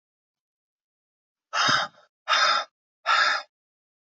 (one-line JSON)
{"exhalation_length": "4.1 s", "exhalation_amplitude": 13115, "exhalation_signal_mean_std_ratio": 0.42, "survey_phase": "beta (2021-08-13 to 2022-03-07)", "age": "18-44", "gender": "Female", "wearing_mask": "No", "symptom_cough_any": true, "symptom_runny_or_blocked_nose": true, "symptom_sore_throat": true, "symptom_onset": "2 days", "smoker_status": "Never smoked", "respiratory_condition_asthma": false, "respiratory_condition_other": false, "recruitment_source": "Test and Trace", "submission_delay": "1 day", "covid_test_result": "Positive", "covid_test_method": "ePCR"}